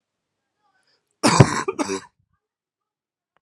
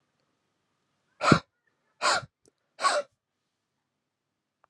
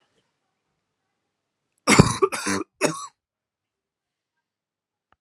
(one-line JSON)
{"cough_length": "3.4 s", "cough_amplitude": 32768, "cough_signal_mean_std_ratio": 0.26, "exhalation_length": "4.7 s", "exhalation_amplitude": 26454, "exhalation_signal_mean_std_ratio": 0.25, "three_cough_length": "5.2 s", "three_cough_amplitude": 32768, "three_cough_signal_mean_std_ratio": 0.24, "survey_phase": "alpha (2021-03-01 to 2021-08-12)", "age": "18-44", "gender": "Male", "wearing_mask": "No", "symptom_fatigue": true, "symptom_headache": true, "symptom_onset": "4 days", "smoker_status": "Ex-smoker", "respiratory_condition_asthma": false, "respiratory_condition_other": false, "recruitment_source": "Test and Trace", "submission_delay": "3 days", "covid_test_result": "Positive", "covid_test_method": "RT-qPCR", "covid_ct_value": 21.6, "covid_ct_gene": "ORF1ab gene", "covid_ct_mean": 21.7, "covid_viral_load": "75000 copies/ml", "covid_viral_load_category": "Low viral load (10K-1M copies/ml)"}